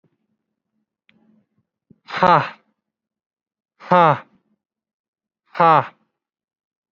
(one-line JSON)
{"exhalation_length": "6.9 s", "exhalation_amplitude": 31528, "exhalation_signal_mean_std_ratio": 0.24, "survey_phase": "beta (2021-08-13 to 2022-03-07)", "age": "18-44", "gender": "Male", "wearing_mask": "Yes", "symptom_none": true, "smoker_status": "Never smoked", "respiratory_condition_asthma": false, "respiratory_condition_other": false, "recruitment_source": "REACT", "submission_delay": "1 day", "covid_test_result": "Negative", "covid_test_method": "RT-qPCR"}